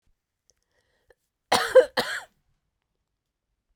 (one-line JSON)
{"cough_length": "3.8 s", "cough_amplitude": 20354, "cough_signal_mean_std_ratio": 0.22, "survey_phase": "beta (2021-08-13 to 2022-03-07)", "age": "45-64", "gender": "Female", "wearing_mask": "No", "symptom_cough_any": true, "symptom_runny_or_blocked_nose": true, "symptom_fatigue": true, "symptom_headache": true, "symptom_change_to_sense_of_smell_or_taste": true, "symptom_loss_of_taste": true, "symptom_onset": "4 days", "smoker_status": "Ex-smoker", "respiratory_condition_asthma": false, "respiratory_condition_other": false, "recruitment_source": "Test and Trace", "submission_delay": "3 days", "covid_test_result": "Positive", "covid_test_method": "LAMP"}